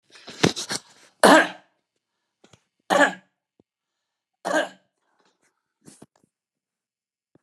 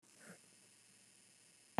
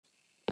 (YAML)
three_cough_length: 7.4 s
three_cough_amplitude: 29204
three_cough_signal_mean_std_ratio: 0.24
cough_length: 1.8 s
cough_amplitude: 3132
cough_signal_mean_std_ratio: 0.21
exhalation_length: 0.5 s
exhalation_amplitude: 4036
exhalation_signal_mean_std_ratio: 0.19
survey_phase: beta (2021-08-13 to 2022-03-07)
age: 65+
gender: Male
wearing_mask: 'No'
symptom_none: true
smoker_status: Never smoked
respiratory_condition_asthma: false
respiratory_condition_other: false
recruitment_source: REACT
submission_delay: 5 days
covid_test_result: Negative
covid_test_method: RT-qPCR
influenza_a_test_result: Negative
influenza_b_test_result: Negative